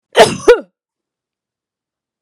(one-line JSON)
{"cough_length": "2.2 s", "cough_amplitude": 32768, "cough_signal_mean_std_ratio": 0.28, "survey_phase": "beta (2021-08-13 to 2022-03-07)", "age": "45-64", "gender": "Female", "wearing_mask": "No", "symptom_none": true, "smoker_status": "Ex-smoker", "respiratory_condition_asthma": false, "respiratory_condition_other": false, "recruitment_source": "REACT", "submission_delay": "1 day", "covid_test_result": "Negative", "covid_test_method": "RT-qPCR"}